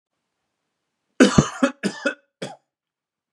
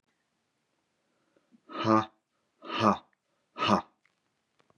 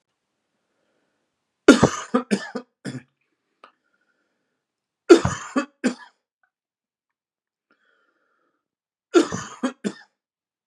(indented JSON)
{
  "cough_length": "3.3 s",
  "cough_amplitude": 32767,
  "cough_signal_mean_std_ratio": 0.27,
  "exhalation_length": "4.8 s",
  "exhalation_amplitude": 13956,
  "exhalation_signal_mean_std_ratio": 0.29,
  "three_cough_length": "10.7 s",
  "three_cough_amplitude": 32767,
  "three_cough_signal_mean_std_ratio": 0.21,
  "survey_phase": "beta (2021-08-13 to 2022-03-07)",
  "age": "45-64",
  "gender": "Male",
  "wearing_mask": "No",
  "symptom_none": true,
  "smoker_status": "Never smoked",
  "respiratory_condition_asthma": false,
  "respiratory_condition_other": false,
  "recruitment_source": "Test and Trace",
  "submission_delay": "2 days",
  "covid_test_result": "Positive",
  "covid_test_method": "RT-qPCR",
  "covid_ct_value": 19.4,
  "covid_ct_gene": "ORF1ab gene"
}